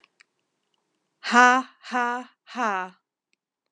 {"exhalation_length": "3.7 s", "exhalation_amplitude": 27079, "exhalation_signal_mean_std_ratio": 0.3, "survey_phase": "alpha (2021-03-01 to 2021-08-12)", "age": "45-64", "gender": "Female", "wearing_mask": "No", "symptom_cough_any": true, "symptom_fatigue": true, "symptom_headache": true, "smoker_status": "Ex-smoker", "respiratory_condition_asthma": false, "respiratory_condition_other": false, "recruitment_source": "Test and Trace", "submission_delay": "2 days", "covid_test_result": "Positive", "covid_test_method": "RT-qPCR"}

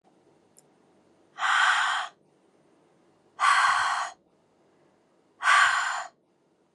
{"exhalation_length": "6.7 s", "exhalation_amplitude": 12471, "exhalation_signal_mean_std_ratio": 0.45, "survey_phase": "beta (2021-08-13 to 2022-03-07)", "age": "18-44", "gender": "Female", "wearing_mask": "No", "symptom_none": true, "symptom_onset": "4 days", "smoker_status": "Never smoked", "respiratory_condition_asthma": false, "respiratory_condition_other": false, "recruitment_source": "REACT", "submission_delay": "1 day", "covid_test_result": "Negative", "covid_test_method": "RT-qPCR"}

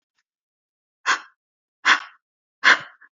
{"exhalation_length": "3.2 s", "exhalation_amplitude": 27469, "exhalation_signal_mean_std_ratio": 0.26, "survey_phase": "beta (2021-08-13 to 2022-03-07)", "age": "18-44", "gender": "Female", "wearing_mask": "No", "symptom_runny_or_blocked_nose": true, "smoker_status": "Never smoked", "respiratory_condition_asthma": false, "respiratory_condition_other": false, "recruitment_source": "REACT", "submission_delay": "2 days", "covid_test_result": "Negative", "covid_test_method": "RT-qPCR", "influenza_a_test_result": "Negative", "influenza_b_test_result": "Negative"}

